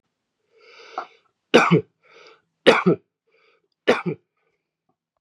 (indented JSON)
{
  "three_cough_length": "5.2 s",
  "three_cough_amplitude": 32647,
  "three_cough_signal_mean_std_ratio": 0.28,
  "survey_phase": "beta (2021-08-13 to 2022-03-07)",
  "age": "45-64",
  "gender": "Male",
  "wearing_mask": "No",
  "symptom_cough_any": true,
  "symptom_runny_or_blocked_nose": true,
  "symptom_loss_of_taste": true,
  "symptom_onset": "3 days",
  "smoker_status": "Never smoked",
  "respiratory_condition_asthma": false,
  "respiratory_condition_other": false,
  "recruitment_source": "Test and Trace",
  "submission_delay": "1 day",
  "covid_test_result": "Positive",
  "covid_test_method": "RT-qPCR",
  "covid_ct_value": 14.8,
  "covid_ct_gene": "ORF1ab gene",
  "covid_ct_mean": 15.0,
  "covid_viral_load": "12000000 copies/ml",
  "covid_viral_load_category": "High viral load (>1M copies/ml)"
}